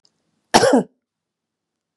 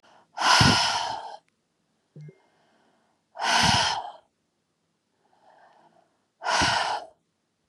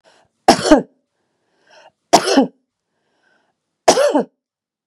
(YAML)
cough_length: 2.0 s
cough_amplitude: 32768
cough_signal_mean_std_ratio: 0.3
exhalation_length: 7.7 s
exhalation_amplitude: 19768
exhalation_signal_mean_std_ratio: 0.42
three_cough_length: 4.9 s
three_cough_amplitude: 32768
three_cough_signal_mean_std_ratio: 0.33
survey_phase: beta (2021-08-13 to 2022-03-07)
age: 45-64
gender: Female
wearing_mask: 'No'
symptom_none: true
symptom_onset: 13 days
smoker_status: Never smoked
respiratory_condition_asthma: false
respiratory_condition_other: false
recruitment_source: REACT
submission_delay: 3 days
covid_test_result: Negative
covid_test_method: RT-qPCR
influenza_a_test_result: Negative
influenza_b_test_result: Negative